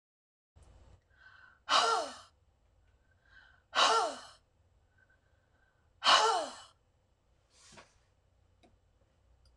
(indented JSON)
{
  "exhalation_length": "9.6 s",
  "exhalation_amplitude": 8438,
  "exhalation_signal_mean_std_ratio": 0.3,
  "survey_phase": "beta (2021-08-13 to 2022-03-07)",
  "age": "45-64",
  "gender": "Female",
  "wearing_mask": "No",
  "symptom_none": true,
  "smoker_status": "Never smoked",
  "respiratory_condition_asthma": false,
  "respiratory_condition_other": false,
  "recruitment_source": "REACT",
  "submission_delay": "1 day",
  "covid_test_result": "Negative",
  "covid_test_method": "RT-qPCR",
  "influenza_a_test_result": "Negative",
  "influenza_b_test_result": "Negative"
}